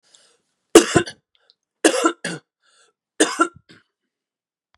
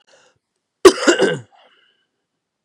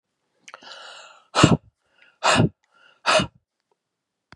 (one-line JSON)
{"three_cough_length": "4.8 s", "three_cough_amplitude": 32768, "three_cough_signal_mean_std_ratio": 0.26, "cough_length": "2.6 s", "cough_amplitude": 32768, "cough_signal_mean_std_ratio": 0.27, "exhalation_length": "4.4 s", "exhalation_amplitude": 32327, "exhalation_signal_mean_std_ratio": 0.31, "survey_phase": "beta (2021-08-13 to 2022-03-07)", "age": "65+", "gender": "Female", "wearing_mask": "No", "symptom_cough_any": true, "symptom_runny_or_blocked_nose": true, "symptom_headache": true, "symptom_onset": "3 days", "smoker_status": "Never smoked", "respiratory_condition_asthma": false, "respiratory_condition_other": false, "recruitment_source": "Test and Trace", "submission_delay": "1 day", "covid_test_result": "Positive", "covid_test_method": "ePCR"}